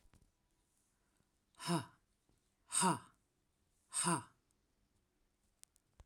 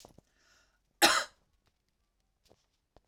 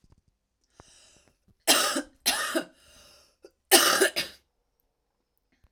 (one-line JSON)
{"exhalation_length": "6.1 s", "exhalation_amplitude": 2758, "exhalation_signal_mean_std_ratio": 0.28, "cough_length": "3.1 s", "cough_amplitude": 11858, "cough_signal_mean_std_ratio": 0.21, "three_cough_length": "5.7 s", "three_cough_amplitude": 28463, "three_cough_signal_mean_std_ratio": 0.33, "survey_phase": "alpha (2021-03-01 to 2021-08-12)", "age": "18-44", "gender": "Female", "wearing_mask": "No", "symptom_cough_any": true, "symptom_onset": "7 days", "smoker_status": "Never smoked", "respiratory_condition_asthma": false, "respiratory_condition_other": false, "recruitment_source": "REACT", "submission_delay": "1 day", "covid_test_result": "Negative", "covid_test_method": "RT-qPCR"}